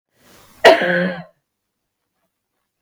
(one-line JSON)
{"cough_length": "2.8 s", "cough_amplitude": 32768, "cough_signal_mean_std_ratio": 0.3, "survey_phase": "beta (2021-08-13 to 2022-03-07)", "age": "65+", "gender": "Female", "wearing_mask": "No", "symptom_cough_any": true, "symptom_runny_or_blocked_nose": true, "symptom_sore_throat": true, "symptom_change_to_sense_of_smell_or_taste": true, "symptom_other": true, "smoker_status": "Ex-smoker", "respiratory_condition_asthma": false, "respiratory_condition_other": false, "recruitment_source": "Test and Trace", "submission_delay": "0 days", "covid_test_result": "Positive", "covid_test_method": "LFT"}